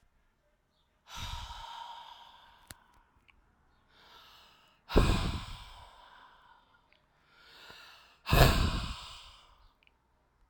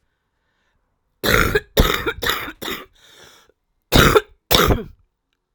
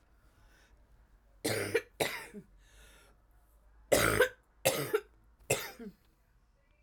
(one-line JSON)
{"exhalation_length": "10.5 s", "exhalation_amplitude": 16412, "exhalation_signal_mean_std_ratio": 0.3, "cough_length": "5.5 s", "cough_amplitude": 32768, "cough_signal_mean_std_ratio": 0.4, "three_cough_length": "6.8 s", "three_cough_amplitude": 8399, "three_cough_signal_mean_std_ratio": 0.36, "survey_phase": "alpha (2021-03-01 to 2021-08-12)", "age": "45-64", "gender": "Female", "wearing_mask": "No", "symptom_cough_any": true, "symptom_abdominal_pain": true, "symptom_fatigue": true, "symptom_fever_high_temperature": true, "symptom_headache": true, "symptom_change_to_sense_of_smell_or_taste": true, "symptom_onset": "4 days", "smoker_status": "Ex-smoker", "respiratory_condition_asthma": false, "respiratory_condition_other": false, "recruitment_source": "Test and Trace", "submission_delay": "2 days", "covid_test_result": "Positive", "covid_test_method": "RT-qPCR", "covid_ct_value": 15.0, "covid_ct_gene": "ORF1ab gene", "covid_ct_mean": 15.3, "covid_viral_load": "9500000 copies/ml", "covid_viral_load_category": "High viral load (>1M copies/ml)"}